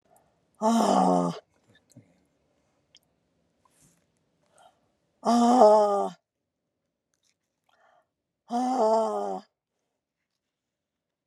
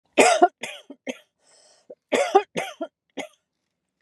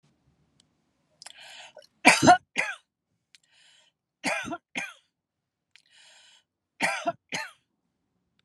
{"exhalation_length": "11.3 s", "exhalation_amplitude": 20494, "exhalation_signal_mean_std_ratio": 0.38, "cough_length": "4.0 s", "cough_amplitude": 27227, "cough_signal_mean_std_ratio": 0.32, "three_cough_length": "8.4 s", "three_cough_amplitude": 27163, "three_cough_signal_mean_std_ratio": 0.24, "survey_phase": "beta (2021-08-13 to 2022-03-07)", "age": "65+", "gender": "Female", "wearing_mask": "No", "symptom_none": true, "smoker_status": "Ex-smoker", "respiratory_condition_asthma": false, "respiratory_condition_other": false, "recruitment_source": "REACT", "submission_delay": "3 days", "covid_test_result": "Negative", "covid_test_method": "RT-qPCR"}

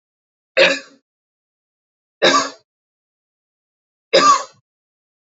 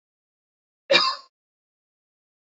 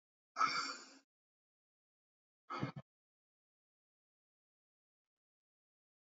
{"three_cough_length": "5.4 s", "three_cough_amplitude": 30089, "three_cough_signal_mean_std_ratio": 0.29, "cough_length": "2.6 s", "cough_amplitude": 24089, "cough_signal_mean_std_ratio": 0.23, "exhalation_length": "6.1 s", "exhalation_amplitude": 2464, "exhalation_signal_mean_std_ratio": 0.23, "survey_phase": "alpha (2021-03-01 to 2021-08-12)", "age": "18-44", "gender": "Male", "wearing_mask": "No", "symptom_none": true, "smoker_status": "Never smoked", "respiratory_condition_asthma": false, "respiratory_condition_other": false, "recruitment_source": "REACT", "submission_delay": "2 days", "covid_test_result": "Negative", "covid_test_method": "RT-qPCR"}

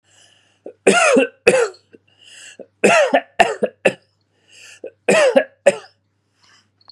{"three_cough_length": "6.9 s", "three_cough_amplitude": 32768, "three_cough_signal_mean_std_ratio": 0.41, "survey_phase": "beta (2021-08-13 to 2022-03-07)", "age": "18-44", "gender": "Male", "wearing_mask": "No", "symptom_none": true, "symptom_onset": "12 days", "smoker_status": "Never smoked", "respiratory_condition_asthma": false, "respiratory_condition_other": false, "recruitment_source": "REACT", "submission_delay": "19 days", "covid_test_result": "Negative", "covid_test_method": "RT-qPCR"}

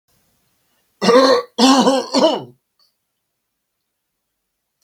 {"cough_length": "4.8 s", "cough_amplitude": 32768, "cough_signal_mean_std_ratio": 0.4, "survey_phase": "beta (2021-08-13 to 2022-03-07)", "age": "65+", "gender": "Male", "wearing_mask": "No", "symptom_none": true, "smoker_status": "Ex-smoker", "respiratory_condition_asthma": false, "respiratory_condition_other": false, "recruitment_source": "REACT", "submission_delay": "2 days", "covid_test_result": "Negative", "covid_test_method": "RT-qPCR", "influenza_a_test_result": "Negative", "influenza_b_test_result": "Negative"}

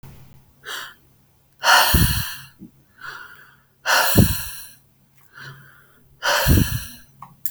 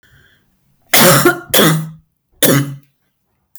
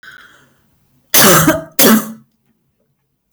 {"exhalation_length": "7.5 s", "exhalation_amplitude": 29237, "exhalation_signal_mean_std_ratio": 0.44, "three_cough_length": "3.6 s", "three_cough_amplitude": 32768, "three_cough_signal_mean_std_ratio": 0.45, "cough_length": "3.3 s", "cough_amplitude": 32768, "cough_signal_mean_std_ratio": 0.4, "survey_phase": "beta (2021-08-13 to 2022-03-07)", "age": "45-64", "gender": "Female", "wearing_mask": "No", "symptom_cough_any": true, "symptom_new_continuous_cough": true, "symptom_shortness_of_breath": true, "smoker_status": "Ex-smoker", "respiratory_condition_asthma": false, "respiratory_condition_other": false, "recruitment_source": "Test and Trace", "submission_delay": "2 days", "covid_test_result": "Positive", "covid_test_method": "RT-qPCR"}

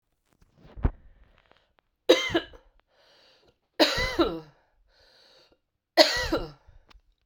{"three_cough_length": "7.3 s", "three_cough_amplitude": 32768, "three_cough_signal_mean_std_ratio": 0.31, "survey_phase": "beta (2021-08-13 to 2022-03-07)", "age": "45-64", "gender": "Female", "wearing_mask": "No", "symptom_cough_any": true, "symptom_runny_or_blocked_nose": true, "symptom_sore_throat": true, "symptom_fatigue": true, "symptom_fever_high_temperature": true, "symptom_headache": true, "symptom_onset": "3 days", "smoker_status": "Ex-smoker", "respiratory_condition_asthma": false, "respiratory_condition_other": false, "recruitment_source": "Test and Trace", "submission_delay": "2 days", "covid_test_result": "Positive", "covid_test_method": "RT-qPCR", "covid_ct_value": 14.9, "covid_ct_gene": "ORF1ab gene", "covid_ct_mean": 15.4, "covid_viral_load": "8700000 copies/ml", "covid_viral_load_category": "High viral load (>1M copies/ml)"}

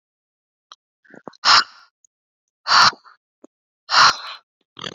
{"exhalation_length": "4.9 s", "exhalation_amplitude": 30504, "exhalation_signal_mean_std_ratio": 0.3, "survey_phase": "beta (2021-08-13 to 2022-03-07)", "age": "18-44", "gender": "Female", "wearing_mask": "No", "symptom_none": true, "smoker_status": "Never smoked", "respiratory_condition_asthma": false, "respiratory_condition_other": false, "recruitment_source": "REACT", "submission_delay": "1 day", "covid_test_result": "Negative", "covid_test_method": "RT-qPCR"}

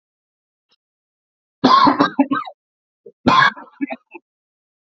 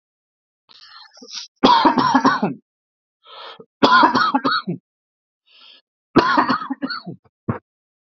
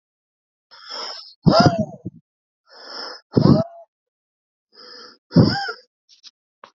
{"cough_length": "4.9 s", "cough_amplitude": 32767, "cough_signal_mean_std_ratio": 0.36, "three_cough_length": "8.2 s", "three_cough_amplitude": 28337, "three_cough_signal_mean_std_ratio": 0.43, "exhalation_length": "6.7 s", "exhalation_amplitude": 27692, "exhalation_signal_mean_std_ratio": 0.32, "survey_phase": "alpha (2021-03-01 to 2021-08-12)", "age": "18-44", "gender": "Male", "wearing_mask": "No", "symptom_fever_high_temperature": true, "symptom_headache": true, "symptom_onset": "2 days", "smoker_status": "Never smoked", "respiratory_condition_asthma": false, "respiratory_condition_other": false, "recruitment_source": "Test and Trace", "submission_delay": "2 days", "covid_test_result": "Positive", "covid_test_method": "RT-qPCR", "covid_ct_value": 18.6, "covid_ct_gene": "ORF1ab gene", "covid_ct_mean": 19.2, "covid_viral_load": "520000 copies/ml", "covid_viral_load_category": "Low viral load (10K-1M copies/ml)"}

